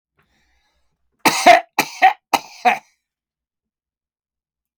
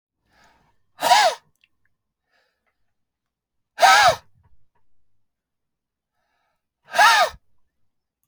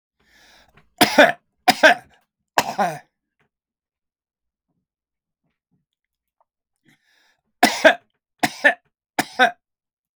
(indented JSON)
{
  "cough_length": "4.8 s",
  "cough_amplitude": 32767,
  "cough_signal_mean_std_ratio": 0.28,
  "exhalation_length": "8.3 s",
  "exhalation_amplitude": 28310,
  "exhalation_signal_mean_std_ratio": 0.28,
  "three_cough_length": "10.2 s",
  "three_cough_amplitude": 32768,
  "three_cough_signal_mean_std_ratio": 0.25,
  "survey_phase": "beta (2021-08-13 to 2022-03-07)",
  "age": "65+",
  "gender": "Male",
  "wearing_mask": "No",
  "symptom_fatigue": true,
  "symptom_headache": true,
  "smoker_status": "Ex-smoker",
  "respiratory_condition_asthma": true,
  "respiratory_condition_other": false,
  "recruitment_source": "REACT",
  "submission_delay": "1 day",
  "covid_test_result": "Negative",
  "covid_test_method": "RT-qPCR"
}